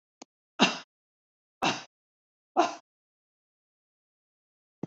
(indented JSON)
{
  "three_cough_length": "4.9 s",
  "three_cough_amplitude": 13871,
  "three_cough_signal_mean_std_ratio": 0.23,
  "survey_phase": "beta (2021-08-13 to 2022-03-07)",
  "age": "65+",
  "gender": "Female",
  "wearing_mask": "No",
  "symptom_fatigue": true,
  "smoker_status": "Never smoked",
  "respiratory_condition_asthma": false,
  "respiratory_condition_other": false,
  "recruitment_source": "REACT",
  "submission_delay": "1 day",
  "covid_test_result": "Negative",
  "covid_test_method": "RT-qPCR",
  "influenza_a_test_result": "Negative",
  "influenza_b_test_result": "Negative"
}